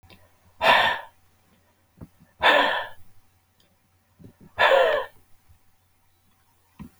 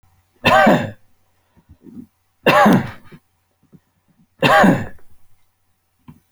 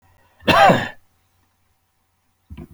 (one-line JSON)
{"exhalation_length": "7.0 s", "exhalation_amplitude": 21297, "exhalation_signal_mean_std_ratio": 0.36, "three_cough_length": "6.3 s", "three_cough_amplitude": 32767, "three_cough_signal_mean_std_ratio": 0.38, "cough_length": "2.7 s", "cough_amplitude": 32768, "cough_signal_mean_std_ratio": 0.31, "survey_phase": "alpha (2021-03-01 to 2021-08-12)", "age": "65+", "gender": "Male", "wearing_mask": "No", "symptom_none": true, "symptom_onset": "8 days", "smoker_status": "Ex-smoker", "respiratory_condition_asthma": false, "respiratory_condition_other": false, "recruitment_source": "REACT", "submission_delay": "2 days", "covid_test_result": "Negative", "covid_test_method": "RT-qPCR"}